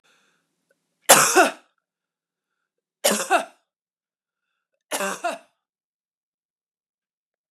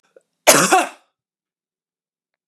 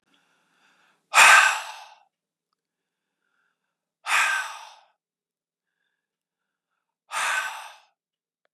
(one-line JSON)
{"three_cough_length": "7.5 s", "three_cough_amplitude": 32768, "three_cough_signal_mean_std_ratio": 0.25, "cough_length": "2.5 s", "cough_amplitude": 32768, "cough_signal_mean_std_ratio": 0.3, "exhalation_length": "8.5 s", "exhalation_amplitude": 27623, "exhalation_signal_mean_std_ratio": 0.27, "survey_phase": "beta (2021-08-13 to 2022-03-07)", "age": "45-64", "gender": "Female", "wearing_mask": "No", "symptom_none": true, "smoker_status": "Never smoked", "respiratory_condition_asthma": false, "respiratory_condition_other": false, "recruitment_source": "REACT", "submission_delay": "2 days", "covid_test_result": "Negative", "covid_test_method": "RT-qPCR", "influenza_a_test_result": "Negative", "influenza_b_test_result": "Negative"}